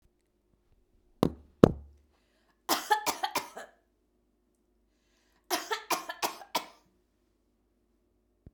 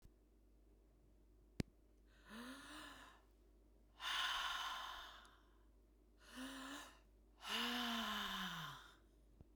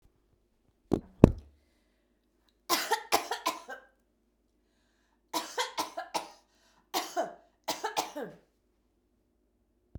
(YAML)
cough_length: 8.5 s
cough_amplitude: 32768
cough_signal_mean_std_ratio: 0.22
exhalation_length: 9.6 s
exhalation_amplitude: 1533
exhalation_signal_mean_std_ratio: 0.57
three_cough_length: 10.0 s
three_cough_amplitude: 32768
three_cough_signal_mean_std_ratio: 0.25
survey_phase: beta (2021-08-13 to 2022-03-07)
age: 45-64
gender: Female
wearing_mask: 'No'
symptom_none: true
smoker_status: Never smoked
respiratory_condition_asthma: false
respiratory_condition_other: false
recruitment_source: REACT
submission_delay: 10 days
covid_test_result: Negative
covid_test_method: RT-qPCR
influenza_a_test_result: Negative
influenza_b_test_result: Negative